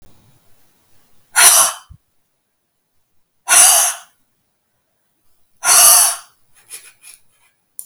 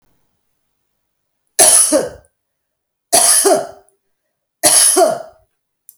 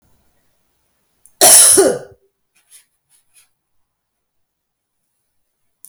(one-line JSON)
{"exhalation_length": "7.9 s", "exhalation_amplitude": 32768, "exhalation_signal_mean_std_ratio": 0.34, "three_cough_length": "6.0 s", "three_cough_amplitude": 32768, "three_cough_signal_mean_std_ratio": 0.42, "cough_length": "5.9 s", "cough_amplitude": 32768, "cough_signal_mean_std_ratio": 0.25, "survey_phase": "beta (2021-08-13 to 2022-03-07)", "age": "45-64", "gender": "Female", "wearing_mask": "No", "symptom_none": true, "smoker_status": "Never smoked", "respiratory_condition_asthma": false, "respiratory_condition_other": false, "recruitment_source": "REACT", "submission_delay": "4 days", "covid_test_result": "Negative", "covid_test_method": "RT-qPCR"}